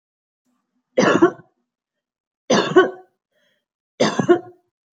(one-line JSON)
{"three_cough_length": "4.9 s", "three_cough_amplitude": 27402, "three_cough_signal_mean_std_ratio": 0.34, "survey_phase": "beta (2021-08-13 to 2022-03-07)", "age": "18-44", "gender": "Female", "wearing_mask": "No", "symptom_none": true, "smoker_status": "Ex-smoker", "respiratory_condition_asthma": false, "respiratory_condition_other": false, "recruitment_source": "REACT", "submission_delay": "1 day", "covid_test_result": "Negative", "covid_test_method": "RT-qPCR", "influenza_a_test_result": "Negative", "influenza_b_test_result": "Negative"}